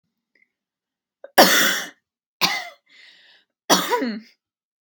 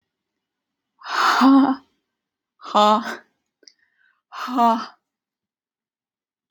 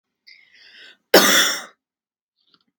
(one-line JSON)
{"three_cough_length": "4.9 s", "three_cough_amplitude": 32768, "three_cough_signal_mean_std_ratio": 0.34, "exhalation_length": "6.5 s", "exhalation_amplitude": 24580, "exhalation_signal_mean_std_ratio": 0.37, "cough_length": "2.8 s", "cough_amplitude": 32768, "cough_signal_mean_std_ratio": 0.31, "survey_phase": "beta (2021-08-13 to 2022-03-07)", "age": "18-44", "gender": "Female", "wearing_mask": "No", "symptom_headache": true, "smoker_status": "Prefer not to say", "respiratory_condition_asthma": true, "respiratory_condition_other": false, "recruitment_source": "REACT", "submission_delay": "2 days", "covid_test_result": "Positive", "covid_test_method": "RT-qPCR", "covid_ct_value": 35.0, "covid_ct_gene": "N gene", "influenza_a_test_result": "Negative", "influenza_b_test_result": "Negative"}